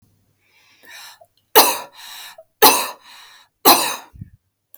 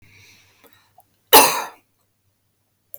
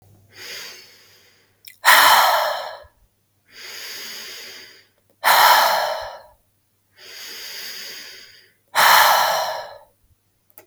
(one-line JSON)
{"three_cough_length": "4.8 s", "three_cough_amplitude": 32768, "three_cough_signal_mean_std_ratio": 0.31, "cough_length": "3.0 s", "cough_amplitude": 32768, "cough_signal_mean_std_ratio": 0.23, "exhalation_length": "10.7 s", "exhalation_amplitude": 32768, "exhalation_signal_mean_std_ratio": 0.43, "survey_phase": "beta (2021-08-13 to 2022-03-07)", "age": "18-44", "gender": "Female", "wearing_mask": "No", "symptom_none": true, "smoker_status": "Never smoked", "respiratory_condition_asthma": false, "respiratory_condition_other": false, "recruitment_source": "REACT", "submission_delay": "2 days", "covid_test_result": "Negative", "covid_test_method": "RT-qPCR", "influenza_a_test_result": "Negative", "influenza_b_test_result": "Negative"}